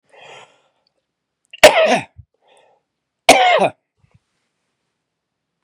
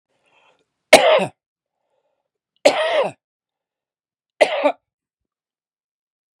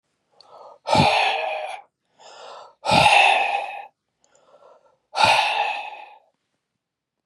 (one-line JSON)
{"cough_length": "5.6 s", "cough_amplitude": 32768, "cough_signal_mean_std_ratio": 0.28, "three_cough_length": "6.4 s", "three_cough_amplitude": 32768, "three_cough_signal_mean_std_ratio": 0.28, "exhalation_length": "7.3 s", "exhalation_amplitude": 28031, "exhalation_signal_mean_std_ratio": 0.47, "survey_phase": "beta (2021-08-13 to 2022-03-07)", "age": "45-64", "gender": "Male", "wearing_mask": "No", "symptom_loss_of_taste": true, "symptom_onset": "12 days", "smoker_status": "Never smoked", "respiratory_condition_asthma": false, "respiratory_condition_other": false, "recruitment_source": "REACT", "submission_delay": "3 days", "covid_test_result": "Negative", "covid_test_method": "RT-qPCR", "influenza_a_test_result": "Negative", "influenza_b_test_result": "Negative"}